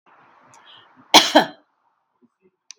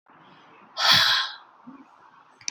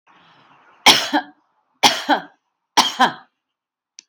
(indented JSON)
{
  "cough_length": "2.8 s",
  "cough_amplitude": 32768,
  "cough_signal_mean_std_ratio": 0.23,
  "exhalation_length": "2.5 s",
  "exhalation_amplitude": 19063,
  "exhalation_signal_mean_std_ratio": 0.4,
  "three_cough_length": "4.1 s",
  "three_cough_amplitude": 32768,
  "three_cough_signal_mean_std_ratio": 0.33,
  "survey_phase": "beta (2021-08-13 to 2022-03-07)",
  "age": "45-64",
  "gender": "Female",
  "wearing_mask": "No",
  "symptom_none": true,
  "smoker_status": "Never smoked",
  "respiratory_condition_asthma": false,
  "respiratory_condition_other": false,
  "recruitment_source": "REACT",
  "submission_delay": "3 days",
  "covid_test_result": "Negative",
  "covid_test_method": "RT-qPCR",
  "influenza_a_test_result": "Negative",
  "influenza_b_test_result": "Negative"
}